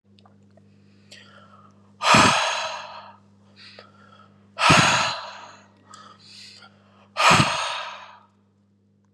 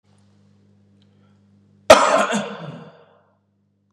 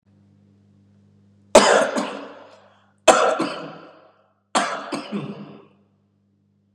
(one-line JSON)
{"exhalation_length": "9.1 s", "exhalation_amplitude": 27328, "exhalation_signal_mean_std_ratio": 0.38, "cough_length": "3.9 s", "cough_amplitude": 32768, "cough_signal_mean_std_ratio": 0.27, "three_cough_length": "6.7 s", "three_cough_amplitude": 32768, "three_cough_signal_mean_std_ratio": 0.35, "survey_phase": "beta (2021-08-13 to 2022-03-07)", "age": "18-44", "gender": "Male", "wearing_mask": "Yes", "symptom_none": true, "smoker_status": "Never smoked", "respiratory_condition_asthma": false, "respiratory_condition_other": false, "recruitment_source": "REACT", "submission_delay": "3 days", "covid_test_result": "Negative", "covid_test_method": "RT-qPCR", "influenza_a_test_result": "Negative", "influenza_b_test_result": "Negative"}